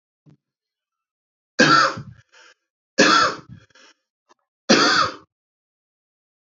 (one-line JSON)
{"three_cough_length": "6.6 s", "three_cough_amplitude": 29581, "three_cough_signal_mean_std_ratio": 0.34, "survey_phase": "beta (2021-08-13 to 2022-03-07)", "age": "18-44", "gender": "Male", "wearing_mask": "No", "symptom_none": true, "symptom_onset": "2 days", "smoker_status": "Never smoked", "respiratory_condition_asthma": false, "respiratory_condition_other": false, "recruitment_source": "REACT", "submission_delay": "1 day", "covid_test_result": "Negative", "covid_test_method": "RT-qPCR", "influenza_a_test_result": "Negative", "influenza_b_test_result": "Negative"}